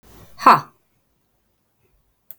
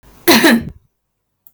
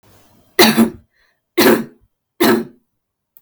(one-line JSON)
{"exhalation_length": "2.4 s", "exhalation_amplitude": 32768, "exhalation_signal_mean_std_ratio": 0.2, "cough_length": "1.5 s", "cough_amplitude": 32768, "cough_signal_mean_std_ratio": 0.43, "three_cough_length": "3.4 s", "three_cough_amplitude": 32768, "three_cough_signal_mean_std_ratio": 0.4, "survey_phase": "beta (2021-08-13 to 2022-03-07)", "age": "18-44", "gender": "Female", "wearing_mask": "No", "symptom_none": true, "smoker_status": "Never smoked", "respiratory_condition_asthma": false, "respiratory_condition_other": false, "recruitment_source": "REACT", "submission_delay": "2 days", "covid_test_result": "Negative", "covid_test_method": "RT-qPCR", "influenza_a_test_result": "Negative", "influenza_b_test_result": "Negative"}